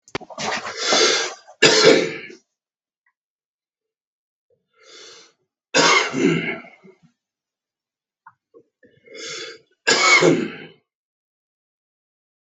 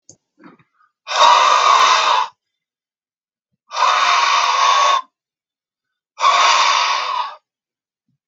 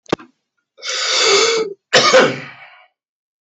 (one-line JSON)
{"three_cough_length": "12.5 s", "three_cough_amplitude": 32766, "three_cough_signal_mean_std_ratio": 0.37, "exhalation_length": "8.3 s", "exhalation_amplitude": 32766, "exhalation_signal_mean_std_ratio": 0.58, "cough_length": "3.4 s", "cough_amplitude": 32768, "cough_signal_mean_std_ratio": 0.51, "survey_phase": "beta (2021-08-13 to 2022-03-07)", "age": "45-64", "gender": "Male", "wearing_mask": "No", "symptom_none": true, "smoker_status": "Current smoker (11 or more cigarettes per day)", "respiratory_condition_asthma": false, "respiratory_condition_other": false, "recruitment_source": "REACT", "submission_delay": "2 days", "covid_test_result": "Negative", "covid_test_method": "RT-qPCR", "influenza_a_test_result": "Negative", "influenza_b_test_result": "Negative"}